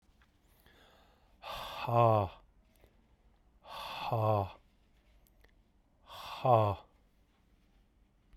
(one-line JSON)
{"exhalation_length": "8.4 s", "exhalation_amplitude": 8077, "exhalation_signal_mean_std_ratio": 0.35, "survey_phase": "beta (2021-08-13 to 2022-03-07)", "age": "45-64", "gender": "Male", "wearing_mask": "No", "symptom_cough_any": true, "symptom_new_continuous_cough": true, "symptom_runny_or_blocked_nose": true, "symptom_sore_throat": true, "symptom_fatigue": true, "symptom_fever_high_temperature": true, "symptom_headache": true, "symptom_change_to_sense_of_smell_or_taste": true, "symptom_loss_of_taste": true, "symptom_onset": "3 days", "smoker_status": "Never smoked", "respiratory_condition_asthma": false, "respiratory_condition_other": false, "recruitment_source": "Test and Trace", "submission_delay": "2 days", "covid_test_result": "Positive", "covid_test_method": "RT-qPCR", "covid_ct_value": 22.1, "covid_ct_gene": "ORF1ab gene", "covid_ct_mean": 22.8, "covid_viral_load": "33000 copies/ml", "covid_viral_load_category": "Low viral load (10K-1M copies/ml)"}